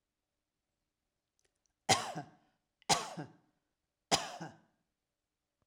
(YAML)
three_cough_length: 5.7 s
three_cough_amplitude: 8317
three_cough_signal_mean_std_ratio: 0.24
survey_phase: alpha (2021-03-01 to 2021-08-12)
age: 45-64
gender: Female
wearing_mask: 'No'
symptom_none: true
smoker_status: Never smoked
respiratory_condition_asthma: false
respiratory_condition_other: false
recruitment_source: REACT
submission_delay: 2 days
covid_test_result: Negative
covid_test_method: RT-qPCR